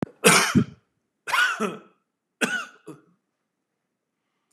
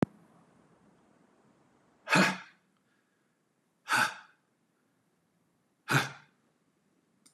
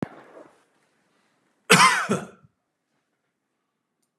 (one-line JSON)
{"three_cough_length": "4.5 s", "three_cough_amplitude": 27740, "three_cough_signal_mean_std_ratio": 0.36, "exhalation_length": "7.3 s", "exhalation_amplitude": 9209, "exhalation_signal_mean_std_ratio": 0.25, "cough_length": "4.2 s", "cough_amplitude": 32755, "cough_signal_mean_std_ratio": 0.26, "survey_phase": "beta (2021-08-13 to 2022-03-07)", "age": "65+", "gender": "Male", "wearing_mask": "No", "symptom_cough_any": true, "symptom_runny_or_blocked_nose": true, "smoker_status": "Never smoked", "respiratory_condition_asthma": false, "respiratory_condition_other": false, "recruitment_source": "Test and Trace", "submission_delay": "1 day", "covid_test_result": "Negative", "covid_test_method": "RT-qPCR"}